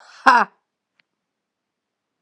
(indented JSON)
{
  "exhalation_length": "2.2 s",
  "exhalation_amplitude": 32768,
  "exhalation_signal_mean_std_ratio": 0.22,
  "survey_phase": "beta (2021-08-13 to 2022-03-07)",
  "age": "18-44",
  "gender": "Female",
  "wearing_mask": "No",
  "symptom_cough_any": true,
  "symptom_runny_or_blocked_nose": true,
  "symptom_sore_throat": true,
  "symptom_fatigue": true,
  "symptom_headache": true,
  "symptom_change_to_sense_of_smell_or_taste": true,
  "smoker_status": "Never smoked",
  "respiratory_condition_asthma": false,
  "respiratory_condition_other": false,
  "recruitment_source": "Test and Trace",
  "submission_delay": "1 day",
  "covid_test_result": "Positive",
  "covid_test_method": "RT-qPCR",
  "covid_ct_value": 28.0,
  "covid_ct_gene": "N gene"
}